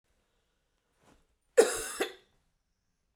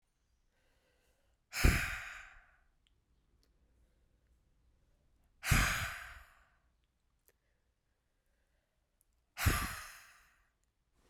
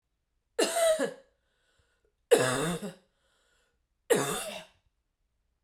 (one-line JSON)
{"cough_length": "3.2 s", "cough_amplitude": 11792, "cough_signal_mean_std_ratio": 0.22, "exhalation_length": "11.1 s", "exhalation_amplitude": 7619, "exhalation_signal_mean_std_ratio": 0.27, "three_cough_length": "5.6 s", "three_cough_amplitude": 13121, "three_cough_signal_mean_std_ratio": 0.39, "survey_phase": "beta (2021-08-13 to 2022-03-07)", "age": "18-44", "gender": "Female", "wearing_mask": "No", "symptom_runny_or_blocked_nose": true, "symptom_sore_throat": true, "symptom_headache": true, "symptom_onset": "5 days", "smoker_status": "Never smoked", "respiratory_condition_asthma": false, "respiratory_condition_other": false, "recruitment_source": "Test and Trace", "submission_delay": "2 days", "covid_test_result": "Positive", "covid_test_method": "RT-qPCR", "covid_ct_value": 17.4, "covid_ct_gene": "ORF1ab gene", "covid_ct_mean": 18.6, "covid_viral_load": "820000 copies/ml", "covid_viral_load_category": "Low viral load (10K-1M copies/ml)"}